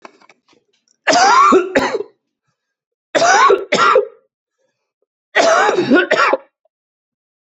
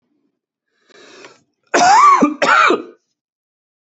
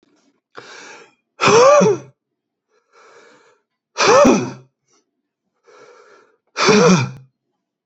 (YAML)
three_cough_length: 7.4 s
three_cough_amplitude: 32767
three_cough_signal_mean_std_ratio: 0.52
cough_length: 3.9 s
cough_amplitude: 29751
cough_signal_mean_std_ratio: 0.44
exhalation_length: 7.9 s
exhalation_amplitude: 32768
exhalation_signal_mean_std_ratio: 0.39
survey_phase: beta (2021-08-13 to 2022-03-07)
age: 18-44
gender: Male
wearing_mask: 'No'
symptom_cough_any: true
symptom_fatigue: true
symptom_other: true
symptom_onset: 2 days
smoker_status: Never smoked
respiratory_condition_asthma: false
respiratory_condition_other: false
recruitment_source: Test and Trace
submission_delay: 1 day
covid_test_result: Positive
covid_test_method: RT-qPCR
covid_ct_value: 28.0
covid_ct_gene: N gene